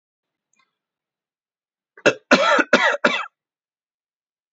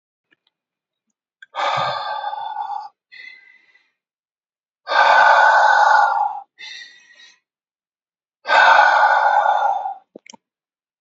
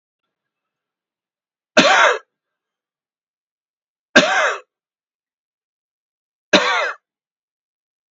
cough_length: 4.5 s
cough_amplitude: 28964
cough_signal_mean_std_ratio: 0.32
exhalation_length: 11.0 s
exhalation_amplitude: 31472
exhalation_signal_mean_std_ratio: 0.49
three_cough_length: 8.1 s
three_cough_amplitude: 29150
three_cough_signal_mean_std_ratio: 0.29
survey_phase: beta (2021-08-13 to 2022-03-07)
age: 45-64
gender: Male
wearing_mask: 'No'
symptom_none: true
smoker_status: Never smoked
respiratory_condition_asthma: false
respiratory_condition_other: false
recruitment_source: REACT
submission_delay: 1 day
covid_test_result: Negative
covid_test_method: RT-qPCR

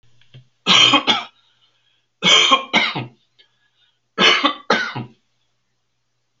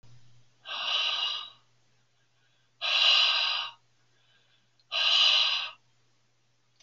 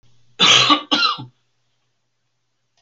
three_cough_length: 6.4 s
three_cough_amplitude: 32768
three_cough_signal_mean_std_ratio: 0.42
exhalation_length: 6.8 s
exhalation_amplitude: 10206
exhalation_signal_mean_std_ratio: 0.49
cough_length: 2.8 s
cough_amplitude: 32768
cough_signal_mean_std_ratio: 0.39
survey_phase: alpha (2021-03-01 to 2021-08-12)
age: 65+
gender: Male
wearing_mask: 'No'
symptom_none: true
smoker_status: Never smoked
respiratory_condition_asthma: false
respiratory_condition_other: false
recruitment_source: REACT
submission_delay: 2 days
covid_test_result: Negative
covid_test_method: RT-qPCR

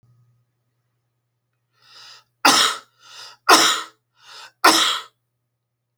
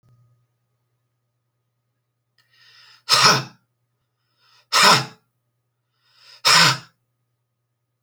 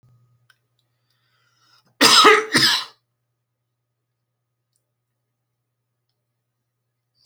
three_cough_length: 6.0 s
three_cough_amplitude: 30497
three_cough_signal_mean_std_ratio: 0.32
exhalation_length: 8.0 s
exhalation_amplitude: 32768
exhalation_signal_mean_std_ratio: 0.28
cough_length: 7.3 s
cough_amplitude: 32768
cough_signal_mean_std_ratio: 0.24
survey_phase: beta (2021-08-13 to 2022-03-07)
age: 45-64
gender: Male
wearing_mask: 'No'
symptom_none: true
smoker_status: Ex-smoker
respiratory_condition_asthma: false
respiratory_condition_other: false
recruitment_source: REACT
submission_delay: 1 day
covid_test_result: Negative
covid_test_method: RT-qPCR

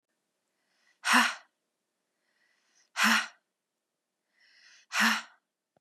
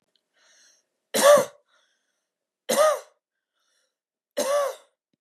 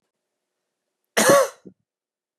exhalation_length: 5.8 s
exhalation_amplitude: 10825
exhalation_signal_mean_std_ratio: 0.3
three_cough_length: 5.2 s
three_cough_amplitude: 21625
three_cough_signal_mean_std_ratio: 0.32
cough_length: 2.4 s
cough_amplitude: 23133
cough_signal_mean_std_ratio: 0.29
survey_phase: beta (2021-08-13 to 2022-03-07)
age: 18-44
gender: Female
wearing_mask: 'No'
symptom_runny_or_blocked_nose: true
symptom_sore_throat: true
symptom_abdominal_pain: true
symptom_diarrhoea: true
symptom_fatigue: true
symptom_headache: true
smoker_status: Never smoked
respiratory_condition_asthma: true
respiratory_condition_other: false
recruitment_source: REACT
submission_delay: 1 day
covid_test_result: Negative
covid_test_method: RT-qPCR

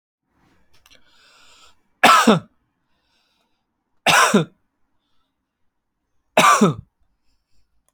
three_cough_length: 7.9 s
three_cough_amplitude: 29937
three_cough_signal_mean_std_ratio: 0.3
survey_phase: alpha (2021-03-01 to 2021-08-12)
age: 18-44
gender: Male
wearing_mask: 'No'
symptom_none: true
smoker_status: Current smoker (e-cigarettes or vapes only)
respiratory_condition_asthma: false
respiratory_condition_other: false
recruitment_source: REACT
submission_delay: 0 days
covid_test_result: Negative
covid_test_method: RT-qPCR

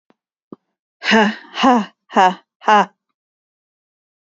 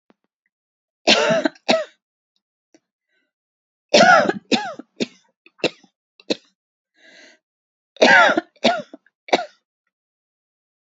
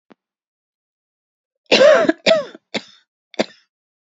exhalation_length: 4.4 s
exhalation_amplitude: 29220
exhalation_signal_mean_std_ratio: 0.37
three_cough_length: 10.8 s
three_cough_amplitude: 30940
three_cough_signal_mean_std_ratio: 0.31
cough_length: 4.1 s
cough_amplitude: 32768
cough_signal_mean_std_ratio: 0.32
survey_phase: beta (2021-08-13 to 2022-03-07)
age: 18-44
gender: Female
wearing_mask: 'No'
symptom_cough_any: true
symptom_shortness_of_breath: true
symptom_abdominal_pain: true
symptom_diarrhoea: true
symptom_fatigue: true
symptom_headache: true
symptom_onset: 2 days
smoker_status: Never smoked
respiratory_condition_asthma: false
respiratory_condition_other: false
recruitment_source: REACT
submission_delay: 2 days
covid_test_result: Negative
covid_test_method: RT-qPCR
influenza_a_test_result: Negative
influenza_b_test_result: Negative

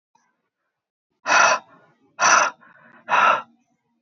exhalation_length: 4.0 s
exhalation_amplitude: 22880
exhalation_signal_mean_std_ratio: 0.4
survey_phase: beta (2021-08-13 to 2022-03-07)
age: 18-44
gender: Male
wearing_mask: 'No'
symptom_none: true
smoker_status: Current smoker (e-cigarettes or vapes only)
respiratory_condition_asthma: false
respiratory_condition_other: false
recruitment_source: REACT
submission_delay: 1 day
covid_test_result: Negative
covid_test_method: RT-qPCR
influenza_a_test_result: Negative
influenza_b_test_result: Negative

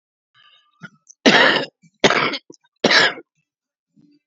three_cough_length: 4.3 s
three_cough_amplitude: 30867
three_cough_signal_mean_std_ratio: 0.37
survey_phase: beta (2021-08-13 to 2022-03-07)
age: 65+
gender: Female
wearing_mask: 'No'
symptom_cough_any: true
smoker_status: Current smoker (11 or more cigarettes per day)
respiratory_condition_asthma: false
respiratory_condition_other: false
recruitment_source: REACT
submission_delay: 2 days
covid_test_result: Negative
covid_test_method: RT-qPCR
influenza_a_test_result: Negative
influenza_b_test_result: Negative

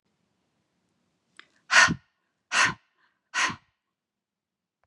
exhalation_length: 4.9 s
exhalation_amplitude: 18625
exhalation_signal_mean_std_ratio: 0.26
survey_phase: beta (2021-08-13 to 2022-03-07)
age: 45-64
gender: Female
wearing_mask: 'No'
symptom_sore_throat: true
symptom_fatigue: true
symptom_headache: true
symptom_onset: 3 days
smoker_status: Never smoked
respiratory_condition_asthma: false
respiratory_condition_other: false
recruitment_source: Test and Trace
submission_delay: 1 day
covid_test_result: Positive
covid_test_method: RT-qPCR
covid_ct_value: 28.2
covid_ct_gene: N gene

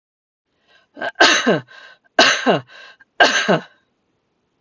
three_cough_length: 4.6 s
three_cough_amplitude: 32768
three_cough_signal_mean_std_ratio: 0.4
survey_phase: beta (2021-08-13 to 2022-03-07)
age: 45-64
gender: Female
wearing_mask: 'No'
symptom_runny_or_blocked_nose: true
symptom_sore_throat: true
smoker_status: Never smoked
respiratory_condition_asthma: true
respiratory_condition_other: false
recruitment_source: REACT
submission_delay: 1 day
covid_test_result: Negative
covid_test_method: RT-qPCR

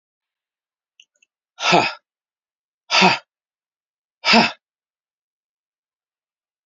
exhalation_length: 6.7 s
exhalation_amplitude: 32603
exhalation_signal_mean_std_ratio: 0.26
survey_phase: beta (2021-08-13 to 2022-03-07)
age: 65+
gender: Male
wearing_mask: 'No'
symptom_cough_any: true
symptom_runny_or_blocked_nose: true
smoker_status: Ex-smoker
respiratory_condition_asthma: false
respiratory_condition_other: false
recruitment_source: Test and Trace
submission_delay: 2 days
covid_test_result: Positive
covid_test_method: ePCR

